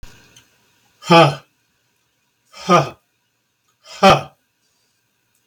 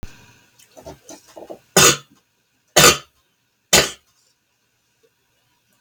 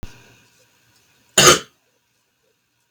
{
  "exhalation_length": "5.5 s",
  "exhalation_amplitude": 32768,
  "exhalation_signal_mean_std_ratio": 0.27,
  "three_cough_length": "5.8 s",
  "three_cough_amplitude": 32768,
  "three_cough_signal_mean_std_ratio": 0.26,
  "cough_length": "2.9 s",
  "cough_amplitude": 32768,
  "cough_signal_mean_std_ratio": 0.23,
  "survey_phase": "beta (2021-08-13 to 2022-03-07)",
  "age": "65+",
  "gender": "Male",
  "wearing_mask": "No",
  "symptom_runny_or_blocked_nose": true,
  "symptom_abdominal_pain": true,
  "symptom_loss_of_taste": true,
  "symptom_onset": "12 days",
  "smoker_status": "Ex-smoker",
  "respiratory_condition_asthma": false,
  "respiratory_condition_other": true,
  "recruitment_source": "REACT",
  "submission_delay": "2 days",
  "covid_test_result": "Negative",
  "covid_test_method": "RT-qPCR",
  "influenza_a_test_result": "Negative",
  "influenza_b_test_result": "Negative"
}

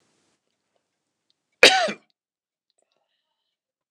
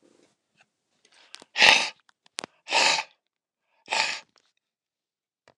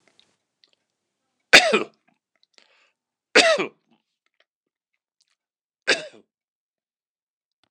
{
  "cough_length": "3.9 s",
  "cough_amplitude": 29204,
  "cough_signal_mean_std_ratio": 0.18,
  "exhalation_length": "5.6 s",
  "exhalation_amplitude": 29204,
  "exhalation_signal_mean_std_ratio": 0.28,
  "three_cough_length": "7.7 s",
  "three_cough_amplitude": 29204,
  "three_cough_signal_mean_std_ratio": 0.2,
  "survey_phase": "beta (2021-08-13 to 2022-03-07)",
  "age": "65+",
  "gender": "Male",
  "wearing_mask": "No",
  "symptom_none": true,
  "smoker_status": "Never smoked",
  "respiratory_condition_asthma": false,
  "respiratory_condition_other": false,
  "recruitment_source": "REACT",
  "submission_delay": "-1 day",
  "covid_test_result": "Negative",
  "covid_test_method": "RT-qPCR",
  "influenza_a_test_result": "Negative",
  "influenza_b_test_result": "Negative"
}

